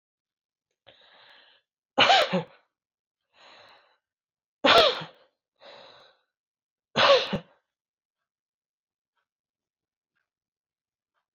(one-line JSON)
{"three_cough_length": "11.3 s", "three_cough_amplitude": 16199, "three_cough_signal_mean_std_ratio": 0.25, "survey_phase": "alpha (2021-03-01 to 2021-08-12)", "age": "45-64", "gender": "Female", "wearing_mask": "No", "symptom_none": true, "smoker_status": "Never smoked", "respiratory_condition_asthma": false, "respiratory_condition_other": false, "recruitment_source": "REACT", "submission_delay": "1 day", "covid_test_result": "Negative", "covid_test_method": "RT-qPCR"}